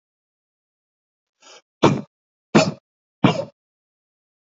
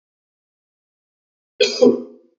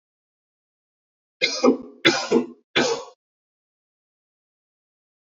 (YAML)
exhalation_length: 4.5 s
exhalation_amplitude: 27443
exhalation_signal_mean_std_ratio: 0.24
cough_length: 2.4 s
cough_amplitude: 27354
cough_signal_mean_std_ratio: 0.28
three_cough_length: 5.4 s
three_cough_amplitude: 26651
three_cough_signal_mean_std_ratio: 0.31
survey_phase: beta (2021-08-13 to 2022-03-07)
age: 18-44
gender: Male
wearing_mask: 'No'
symptom_cough_any: true
symptom_runny_or_blocked_nose: true
symptom_sore_throat: true
symptom_fatigue: true
symptom_other: true
symptom_onset: 2 days
smoker_status: Ex-smoker
respiratory_condition_asthma: false
respiratory_condition_other: false
recruitment_source: REACT
submission_delay: 3 days
covid_test_result: Negative
covid_test_method: RT-qPCR